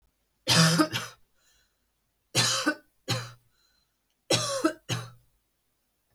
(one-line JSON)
{"three_cough_length": "6.1 s", "three_cough_amplitude": 12955, "three_cough_signal_mean_std_ratio": 0.39, "survey_phase": "beta (2021-08-13 to 2022-03-07)", "age": "18-44", "gender": "Female", "wearing_mask": "No", "symptom_none": true, "smoker_status": "Never smoked", "respiratory_condition_asthma": false, "respiratory_condition_other": false, "recruitment_source": "REACT", "submission_delay": "1 day", "covid_test_result": "Negative", "covid_test_method": "RT-qPCR"}